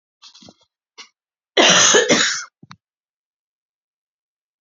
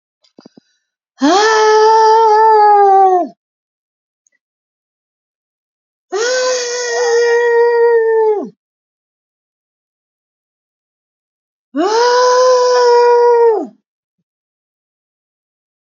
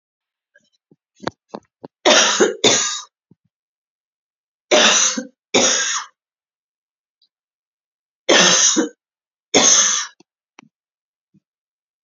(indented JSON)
{
  "cough_length": "4.6 s",
  "cough_amplitude": 32767,
  "cough_signal_mean_std_ratio": 0.34,
  "exhalation_length": "15.9 s",
  "exhalation_amplitude": 31122,
  "exhalation_signal_mean_std_ratio": 0.59,
  "three_cough_length": "12.0 s",
  "three_cough_amplitude": 32767,
  "three_cough_signal_mean_std_ratio": 0.39,
  "survey_phase": "beta (2021-08-13 to 2022-03-07)",
  "age": "45-64",
  "gender": "Female",
  "wearing_mask": "No",
  "symptom_none": true,
  "symptom_onset": "3 days",
  "smoker_status": "Current smoker (e-cigarettes or vapes only)",
  "respiratory_condition_asthma": false,
  "respiratory_condition_other": false,
  "recruitment_source": "Test and Trace",
  "submission_delay": "1 day",
  "covid_test_result": "Positive",
  "covid_test_method": "RT-qPCR",
  "covid_ct_value": 19.5,
  "covid_ct_gene": "N gene",
  "covid_ct_mean": 20.3,
  "covid_viral_load": "220000 copies/ml",
  "covid_viral_load_category": "Low viral load (10K-1M copies/ml)"
}